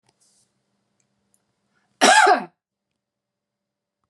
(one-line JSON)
{"cough_length": "4.1 s", "cough_amplitude": 32135, "cough_signal_mean_std_ratio": 0.25, "survey_phase": "beta (2021-08-13 to 2022-03-07)", "age": "65+", "gender": "Male", "wearing_mask": "Yes", "symptom_none": true, "smoker_status": "Ex-smoker", "respiratory_condition_asthma": false, "respiratory_condition_other": false, "recruitment_source": "Test and Trace", "submission_delay": "2 days", "covid_test_result": "Negative", "covid_test_method": "RT-qPCR"}